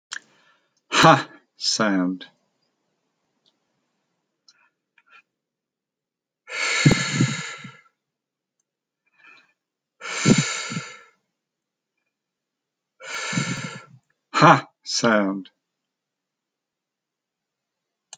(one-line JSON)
{"exhalation_length": "18.2 s", "exhalation_amplitude": 29193, "exhalation_signal_mean_std_ratio": 0.31, "survey_phase": "alpha (2021-03-01 to 2021-08-12)", "age": "65+", "gender": "Male", "wearing_mask": "No", "symptom_none": true, "smoker_status": "Ex-smoker", "respiratory_condition_asthma": false, "respiratory_condition_other": true, "recruitment_source": "REACT", "submission_delay": "4 days", "covid_test_result": "Negative", "covid_test_method": "RT-qPCR"}